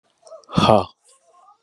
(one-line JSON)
{"exhalation_length": "1.6 s", "exhalation_amplitude": 32767, "exhalation_signal_mean_std_ratio": 0.31, "survey_phase": "beta (2021-08-13 to 2022-03-07)", "age": "45-64", "gender": "Male", "wearing_mask": "No", "symptom_cough_any": true, "symptom_runny_or_blocked_nose": true, "symptom_fatigue": true, "symptom_onset": "12 days", "smoker_status": "Ex-smoker", "respiratory_condition_asthma": false, "respiratory_condition_other": false, "recruitment_source": "REACT", "submission_delay": "8 days", "covid_test_result": "Negative", "covid_test_method": "RT-qPCR", "influenza_a_test_result": "Negative", "influenza_b_test_result": "Negative"}